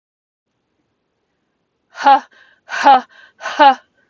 exhalation_length: 4.1 s
exhalation_amplitude: 32768
exhalation_signal_mean_std_ratio: 0.32
survey_phase: beta (2021-08-13 to 2022-03-07)
age: 45-64
gender: Female
wearing_mask: 'No'
symptom_runny_or_blocked_nose: true
symptom_sore_throat: true
smoker_status: Never smoked
respiratory_condition_asthma: true
respiratory_condition_other: false
recruitment_source: REACT
submission_delay: 1 day
covid_test_result: Negative
covid_test_method: RT-qPCR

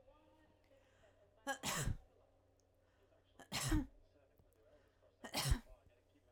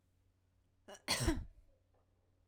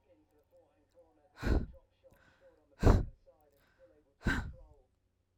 three_cough_length: 6.3 s
three_cough_amplitude: 2018
three_cough_signal_mean_std_ratio: 0.35
cough_length: 2.5 s
cough_amplitude: 2925
cough_signal_mean_std_ratio: 0.33
exhalation_length: 5.4 s
exhalation_amplitude: 8044
exhalation_signal_mean_std_ratio: 0.27
survey_phase: alpha (2021-03-01 to 2021-08-12)
age: 18-44
gender: Female
wearing_mask: 'No'
symptom_none: true
smoker_status: Ex-smoker
respiratory_condition_asthma: false
respiratory_condition_other: false
recruitment_source: REACT
submission_delay: 2 days
covid_test_result: Negative
covid_test_method: RT-qPCR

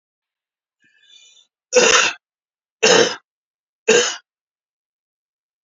three_cough_length: 5.6 s
three_cough_amplitude: 31026
three_cough_signal_mean_std_ratio: 0.32
survey_phase: beta (2021-08-13 to 2022-03-07)
age: 65+
gender: Male
wearing_mask: 'No'
symptom_cough_any: true
symptom_runny_or_blocked_nose: true
smoker_status: Ex-smoker
respiratory_condition_asthma: false
respiratory_condition_other: false
recruitment_source: Test and Trace
submission_delay: 2 days
covid_test_result: Positive
covid_test_method: ePCR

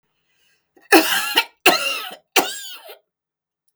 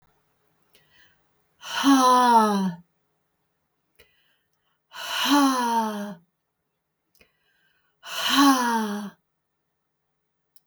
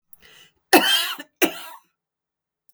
three_cough_length: 3.8 s
three_cough_amplitude: 32768
three_cough_signal_mean_std_ratio: 0.38
exhalation_length: 10.7 s
exhalation_amplitude: 16084
exhalation_signal_mean_std_ratio: 0.43
cough_length: 2.7 s
cough_amplitude: 32768
cough_signal_mean_std_ratio: 0.32
survey_phase: beta (2021-08-13 to 2022-03-07)
age: 65+
gender: Female
wearing_mask: 'No'
symptom_none: true
smoker_status: Never smoked
respiratory_condition_asthma: false
respiratory_condition_other: false
recruitment_source: REACT
submission_delay: 2 days
covid_test_result: Negative
covid_test_method: RT-qPCR
influenza_a_test_result: Negative
influenza_b_test_result: Negative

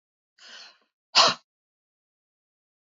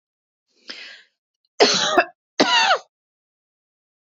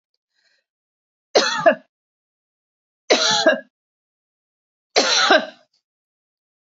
exhalation_length: 3.0 s
exhalation_amplitude: 20887
exhalation_signal_mean_std_ratio: 0.2
cough_length: 4.1 s
cough_amplitude: 29045
cough_signal_mean_std_ratio: 0.36
three_cough_length: 6.7 s
three_cough_amplitude: 32767
three_cough_signal_mean_std_ratio: 0.34
survey_phase: beta (2021-08-13 to 2022-03-07)
age: 45-64
gender: Female
wearing_mask: 'No'
symptom_fatigue: true
symptom_onset: 7 days
smoker_status: Never smoked
respiratory_condition_asthma: false
respiratory_condition_other: false
recruitment_source: REACT
submission_delay: 1 day
covid_test_result: Negative
covid_test_method: RT-qPCR
influenza_a_test_result: Negative
influenza_b_test_result: Negative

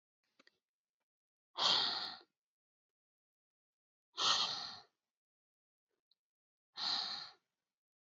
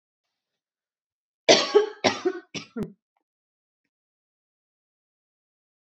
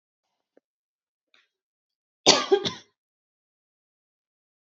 exhalation_length: 8.1 s
exhalation_amplitude: 4039
exhalation_signal_mean_std_ratio: 0.32
three_cough_length: 5.8 s
three_cough_amplitude: 24863
three_cough_signal_mean_std_ratio: 0.24
cough_length: 4.8 s
cough_amplitude: 29888
cough_signal_mean_std_ratio: 0.19
survey_phase: beta (2021-08-13 to 2022-03-07)
age: 18-44
gender: Female
wearing_mask: 'No'
symptom_fatigue: true
symptom_headache: true
symptom_change_to_sense_of_smell_or_taste: true
symptom_onset: 6 days
smoker_status: Never smoked
respiratory_condition_asthma: false
respiratory_condition_other: false
recruitment_source: Test and Trace
submission_delay: 1 day
covid_test_result: Positive
covid_test_method: RT-qPCR
covid_ct_value: 20.8
covid_ct_gene: ORF1ab gene
covid_ct_mean: 21.2
covid_viral_load: 110000 copies/ml
covid_viral_load_category: Low viral load (10K-1M copies/ml)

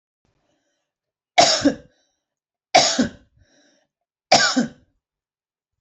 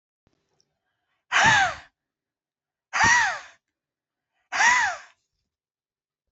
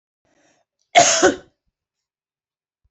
three_cough_length: 5.8 s
three_cough_amplitude: 30552
three_cough_signal_mean_std_ratio: 0.31
exhalation_length: 6.3 s
exhalation_amplitude: 14607
exhalation_signal_mean_std_ratio: 0.36
cough_length: 2.9 s
cough_amplitude: 29553
cough_signal_mean_std_ratio: 0.28
survey_phase: beta (2021-08-13 to 2022-03-07)
age: 45-64
gender: Female
wearing_mask: 'No'
symptom_none: true
smoker_status: Never smoked
respiratory_condition_asthma: false
respiratory_condition_other: false
recruitment_source: Test and Trace
submission_delay: 2 days
covid_test_result: Negative
covid_test_method: ePCR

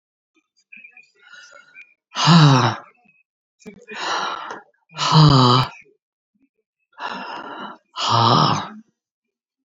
exhalation_length: 9.6 s
exhalation_amplitude: 28851
exhalation_signal_mean_std_ratio: 0.41
survey_phase: beta (2021-08-13 to 2022-03-07)
age: 65+
gender: Female
wearing_mask: 'No'
symptom_cough_any: true
smoker_status: Current smoker (11 or more cigarettes per day)
respiratory_condition_asthma: false
respiratory_condition_other: false
recruitment_source: REACT
submission_delay: 2 days
covid_test_result: Negative
covid_test_method: RT-qPCR
influenza_a_test_result: Negative
influenza_b_test_result: Negative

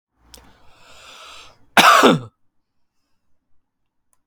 cough_length: 4.3 s
cough_amplitude: 31266
cough_signal_mean_std_ratio: 0.27
survey_phase: alpha (2021-03-01 to 2021-08-12)
age: 18-44
gender: Male
wearing_mask: 'No'
symptom_none: true
smoker_status: Current smoker (e-cigarettes or vapes only)
respiratory_condition_asthma: false
respiratory_condition_other: false
recruitment_source: REACT
submission_delay: 0 days
covid_test_result: Negative
covid_test_method: RT-qPCR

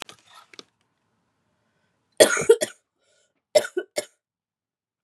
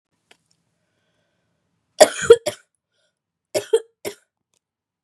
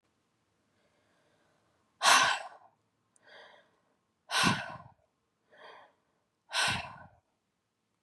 cough_length: 5.0 s
cough_amplitude: 32767
cough_signal_mean_std_ratio: 0.22
three_cough_length: 5.0 s
three_cough_amplitude: 32768
three_cough_signal_mean_std_ratio: 0.18
exhalation_length: 8.0 s
exhalation_amplitude: 13614
exhalation_signal_mean_std_ratio: 0.28
survey_phase: beta (2021-08-13 to 2022-03-07)
age: 18-44
gender: Female
wearing_mask: 'No'
symptom_cough_any: true
symptom_runny_or_blocked_nose: true
symptom_fatigue: true
symptom_change_to_sense_of_smell_or_taste: true
symptom_onset: 3 days
smoker_status: Never smoked
respiratory_condition_asthma: false
respiratory_condition_other: false
recruitment_source: Test and Trace
submission_delay: 2 days
covid_test_result: Positive
covid_test_method: ePCR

